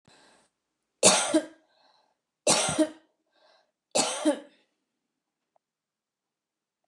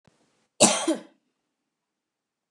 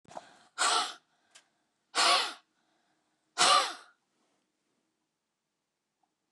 three_cough_length: 6.9 s
three_cough_amplitude: 22321
three_cough_signal_mean_std_ratio: 0.31
cough_length: 2.5 s
cough_amplitude: 26215
cough_signal_mean_std_ratio: 0.26
exhalation_length: 6.3 s
exhalation_amplitude: 11221
exhalation_signal_mean_std_ratio: 0.32
survey_phase: beta (2021-08-13 to 2022-03-07)
age: 65+
gender: Female
wearing_mask: 'No'
symptom_none: true
smoker_status: Never smoked
respiratory_condition_asthma: false
respiratory_condition_other: false
recruitment_source: REACT
submission_delay: 2 days
covid_test_result: Negative
covid_test_method: RT-qPCR
influenza_a_test_result: Negative
influenza_b_test_result: Negative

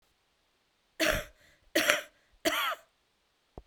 three_cough_length: 3.7 s
three_cough_amplitude: 16446
three_cough_signal_mean_std_ratio: 0.37
survey_phase: beta (2021-08-13 to 2022-03-07)
age: 45-64
gender: Female
wearing_mask: 'No'
symptom_none: true
smoker_status: Current smoker (1 to 10 cigarettes per day)
respiratory_condition_asthma: false
respiratory_condition_other: false
recruitment_source: REACT
submission_delay: 0 days
covid_test_result: Negative
covid_test_method: RT-qPCR
influenza_a_test_result: Negative
influenza_b_test_result: Negative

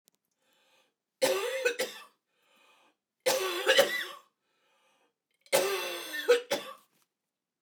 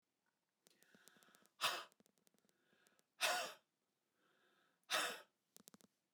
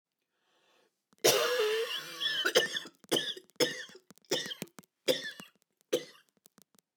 three_cough_length: 7.6 s
three_cough_amplitude: 10900
three_cough_signal_mean_std_ratio: 0.41
exhalation_length: 6.1 s
exhalation_amplitude: 1883
exhalation_signal_mean_std_ratio: 0.29
cough_length: 7.0 s
cough_amplitude: 8901
cough_signal_mean_std_ratio: 0.45
survey_phase: beta (2021-08-13 to 2022-03-07)
age: 45-64
gender: Female
wearing_mask: 'No'
symptom_none: true
symptom_onset: 2 days
smoker_status: Never smoked
respiratory_condition_asthma: false
respiratory_condition_other: false
recruitment_source: REACT
submission_delay: 2 days
covid_test_result: Negative
covid_test_method: RT-qPCR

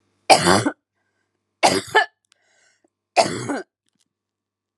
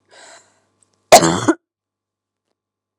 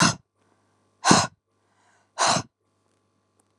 three_cough_length: 4.8 s
three_cough_amplitude: 32768
three_cough_signal_mean_std_ratio: 0.33
cough_length: 3.0 s
cough_amplitude: 32768
cough_signal_mean_std_ratio: 0.24
exhalation_length: 3.6 s
exhalation_amplitude: 31134
exhalation_signal_mean_std_ratio: 0.31
survey_phase: alpha (2021-03-01 to 2021-08-12)
age: 18-44
gender: Female
wearing_mask: 'No'
symptom_none: true
smoker_status: Never smoked
respiratory_condition_asthma: false
respiratory_condition_other: false
recruitment_source: REACT
submission_delay: 1 day
covid_test_result: Negative
covid_test_method: RT-qPCR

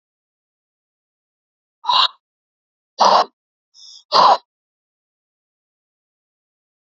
exhalation_length: 7.0 s
exhalation_amplitude: 32768
exhalation_signal_mean_std_ratio: 0.25
survey_phase: alpha (2021-03-01 to 2021-08-12)
age: 45-64
gender: Male
wearing_mask: 'No'
symptom_cough_any: true
symptom_fatigue: true
symptom_headache: true
symptom_onset: 2 days
smoker_status: Never smoked
respiratory_condition_asthma: true
respiratory_condition_other: false
recruitment_source: Test and Trace
submission_delay: 1 day
covid_test_result: Positive
covid_test_method: RT-qPCR
covid_ct_value: 15.9
covid_ct_gene: ORF1ab gene
covid_ct_mean: 16.4
covid_viral_load: 4300000 copies/ml
covid_viral_load_category: High viral load (>1M copies/ml)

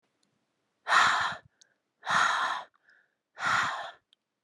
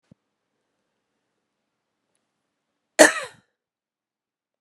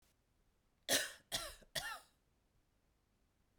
exhalation_length: 4.4 s
exhalation_amplitude: 12466
exhalation_signal_mean_std_ratio: 0.46
cough_length: 4.6 s
cough_amplitude: 32768
cough_signal_mean_std_ratio: 0.13
three_cough_length: 3.6 s
three_cough_amplitude: 3235
three_cough_signal_mean_std_ratio: 0.31
survey_phase: beta (2021-08-13 to 2022-03-07)
age: 18-44
gender: Female
wearing_mask: 'No'
symptom_runny_or_blocked_nose: true
symptom_change_to_sense_of_smell_or_taste: true
symptom_loss_of_taste: true
smoker_status: Never smoked
respiratory_condition_asthma: false
respiratory_condition_other: false
recruitment_source: Test and Trace
submission_delay: 3 days
covid_test_result: Positive
covid_test_method: ePCR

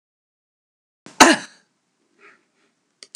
cough_length: 3.2 s
cough_amplitude: 32768
cough_signal_mean_std_ratio: 0.18
survey_phase: alpha (2021-03-01 to 2021-08-12)
age: 65+
gender: Female
wearing_mask: 'No'
symptom_none: true
smoker_status: Never smoked
respiratory_condition_asthma: false
respiratory_condition_other: false
recruitment_source: REACT
submission_delay: 1 day
covid_test_result: Negative
covid_test_method: RT-qPCR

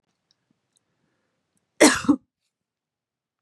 cough_length: 3.4 s
cough_amplitude: 31156
cough_signal_mean_std_ratio: 0.2
survey_phase: beta (2021-08-13 to 2022-03-07)
age: 45-64
gender: Female
wearing_mask: 'No'
symptom_cough_any: true
symptom_new_continuous_cough: true
symptom_runny_or_blocked_nose: true
symptom_sore_throat: true
symptom_fatigue: true
symptom_fever_high_temperature: true
symptom_headache: true
symptom_change_to_sense_of_smell_or_taste: true
symptom_loss_of_taste: true
symptom_onset: 9 days
smoker_status: Ex-smoker
respiratory_condition_asthma: false
respiratory_condition_other: false
recruitment_source: Test and Trace
submission_delay: 2 days
covid_test_result: Positive
covid_test_method: RT-qPCR
covid_ct_value: 18.9
covid_ct_gene: ORF1ab gene
covid_ct_mean: 20.2
covid_viral_load: 230000 copies/ml
covid_viral_load_category: Low viral load (10K-1M copies/ml)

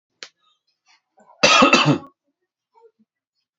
cough_length: 3.6 s
cough_amplitude: 29309
cough_signal_mean_std_ratio: 0.31
survey_phase: beta (2021-08-13 to 2022-03-07)
age: 18-44
gender: Male
wearing_mask: 'No'
symptom_fatigue: true
smoker_status: Never smoked
respiratory_condition_asthma: false
respiratory_condition_other: false
recruitment_source: REACT
submission_delay: 1 day
covid_test_result: Negative
covid_test_method: RT-qPCR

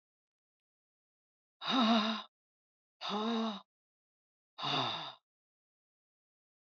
exhalation_length: 6.7 s
exhalation_amplitude: 3963
exhalation_signal_mean_std_ratio: 0.39
survey_phase: beta (2021-08-13 to 2022-03-07)
age: 45-64
gender: Female
wearing_mask: 'No'
symptom_runny_or_blocked_nose: true
smoker_status: Never smoked
respiratory_condition_asthma: false
respiratory_condition_other: false
recruitment_source: REACT
submission_delay: 3 days
covid_test_result: Negative
covid_test_method: RT-qPCR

